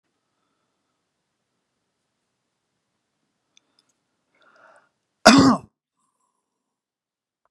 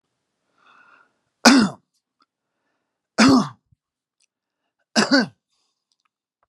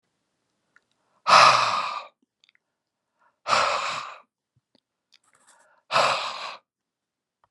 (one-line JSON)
{"cough_length": "7.5 s", "cough_amplitude": 32768, "cough_signal_mean_std_ratio": 0.16, "three_cough_length": "6.5 s", "three_cough_amplitude": 32768, "three_cough_signal_mean_std_ratio": 0.28, "exhalation_length": "7.5 s", "exhalation_amplitude": 26096, "exhalation_signal_mean_std_ratio": 0.33, "survey_phase": "beta (2021-08-13 to 2022-03-07)", "age": "65+", "gender": "Male", "wearing_mask": "No", "symptom_none": true, "smoker_status": "Current smoker (1 to 10 cigarettes per day)", "respiratory_condition_asthma": false, "respiratory_condition_other": false, "recruitment_source": "REACT", "submission_delay": "3 days", "covid_test_result": "Negative", "covid_test_method": "RT-qPCR"}